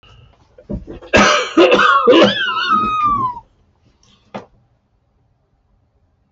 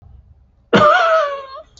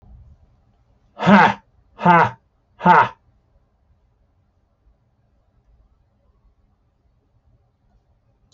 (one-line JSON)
{"three_cough_length": "6.3 s", "three_cough_amplitude": 29573, "three_cough_signal_mean_std_ratio": 0.51, "cough_length": "1.8 s", "cough_amplitude": 27561, "cough_signal_mean_std_ratio": 0.54, "exhalation_length": "8.5 s", "exhalation_amplitude": 32549, "exhalation_signal_mean_std_ratio": 0.25, "survey_phase": "beta (2021-08-13 to 2022-03-07)", "age": "65+", "gender": "Male", "wearing_mask": "No", "symptom_shortness_of_breath": true, "symptom_sore_throat": true, "symptom_headache": true, "symptom_onset": "12 days", "smoker_status": "Never smoked", "respiratory_condition_asthma": false, "respiratory_condition_other": true, "recruitment_source": "REACT", "submission_delay": "2 days", "covid_test_result": "Negative", "covid_test_method": "RT-qPCR"}